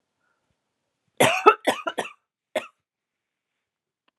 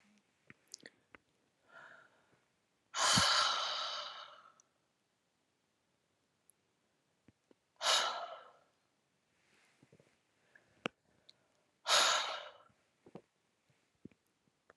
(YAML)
cough_length: 4.2 s
cough_amplitude: 32728
cough_signal_mean_std_ratio: 0.24
exhalation_length: 14.8 s
exhalation_amplitude: 5511
exhalation_signal_mean_std_ratio: 0.3
survey_phase: beta (2021-08-13 to 2022-03-07)
age: 45-64
gender: Female
wearing_mask: 'No'
symptom_none: true
smoker_status: Never smoked
respiratory_condition_asthma: false
respiratory_condition_other: false
recruitment_source: REACT
submission_delay: 2 days
covid_test_result: Negative
covid_test_method: RT-qPCR